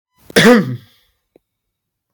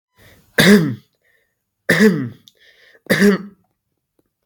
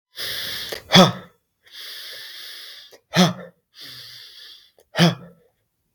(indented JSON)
{
  "cough_length": "2.1 s",
  "cough_amplitude": 32767,
  "cough_signal_mean_std_ratio": 0.34,
  "three_cough_length": "4.5 s",
  "three_cough_amplitude": 32768,
  "three_cough_signal_mean_std_ratio": 0.38,
  "exhalation_length": "5.9 s",
  "exhalation_amplitude": 32768,
  "exhalation_signal_mean_std_ratio": 0.33,
  "survey_phase": "beta (2021-08-13 to 2022-03-07)",
  "age": "18-44",
  "gender": "Male",
  "wearing_mask": "No",
  "symptom_none": true,
  "smoker_status": "Never smoked",
  "respiratory_condition_asthma": false,
  "respiratory_condition_other": false,
  "recruitment_source": "REACT",
  "submission_delay": "3 days",
  "covid_test_result": "Negative",
  "covid_test_method": "RT-qPCR",
  "influenza_a_test_result": "Negative",
  "influenza_b_test_result": "Negative"
}